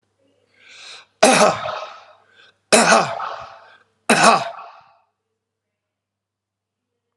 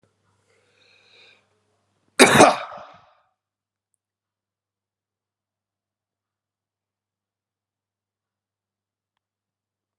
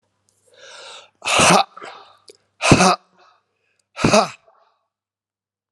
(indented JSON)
{
  "three_cough_length": "7.2 s",
  "three_cough_amplitude": 32767,
  "three_cough_signal_mean_std_ratio": 0.34,
  "cough_length": "10.0 s",
  "cough_amplitude": 32768,
  "cough_signal_mean_std_ratio": 0.15,
  "exhalation_length": "5.7 s",
  "exhalation_amplitude": 32768,
  "exhalation_signal_mean_std_ratio": 0.33,
  "survey_phase": "alpha (2021-03-01 to 2021-08-12)",
  "age": "45-64",
  "gender": "Male",
  "wearing_mask": "No",
  "symptom_cough_any": true,
  "symptom_headache": true,
  "smoker_status": "Never smoked",
  "respiratory_condition_asthma": false,
  "respiratory_condition_other": false,
  "recruitment_source": "Test and Trace",
  "submission_delay": "1 day",
  "covid_test_result": "Positive",
  "covid_test_method": "RT-qPCR"
}